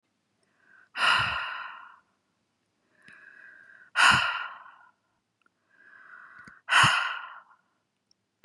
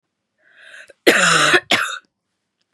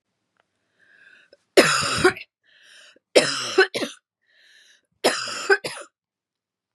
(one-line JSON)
{"exhalation_length": "8.4 s", "exhalation_amplitude": 16474, "exhalation_signal_mean_std_ratio": 0.34, "cough_length": "2.7 s", "cough_amplitude": 32768, "cough_signal_mean_std_ratio": 0.43, "three_cough_length": "6.7 s", "three_cough_amplitude": 32767, "three_cough_signal_mean_std_ratio": 0.34, "survey_phase": "beta (2021-08-13 to 2022-03-07)", "age": "18-44", "gender": "Female", "wearing_mask": "No", "symptom_cough_any": true, "symptom_runny_or_blocked_nose": true, "symptom_sore_throat": true, "symptom_fatigue": true, "symptom_headache": true, "symptom_onset": "7 days", "smoker_status": "Never smoked", "respiratory_condition_asthma": false, "respiratory_condition_other": false, "recruitment_source": "Test and Trace", "submission_delay": "2 days", "covid_test_result": "Positive", "covid_test_method": "RT-qPCR", "covid_ct_value": 22.7, "covid_ct_gene": "N gene"}